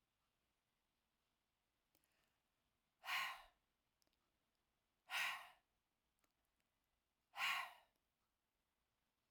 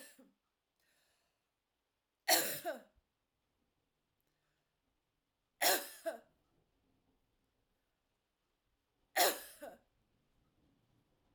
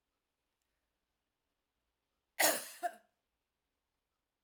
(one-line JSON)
{"exhalation_length": "9.3 s", "exhalation_amplitude": 882, "exhalation_signal_mean_std_ratio": 0.26, "three_cough_length": "11.3 s", "three_cough_amplitude": 5808, "three_cough_signal_mean_std_ratio": 0.22, "cough_length": "4.4 s", "cough_amplitude": 6284, "cough_signal_mean_std_ratio": 0.2, "survey_phase": "alpha (2021-03-01 to 2021-08-12)", "age": "65+", "gender": "Female", "wearing_mask": "No", "symptom_cough_any": true, "smoker_status": "Never smoked", "respiratory_condition_asthma": false, "respiratory_condition_other": false, "recruitment_source": "REACT", "submission_delay": "1 day", "covid_test_result": "Negative", "covid_test_method": "RT-qPCR"}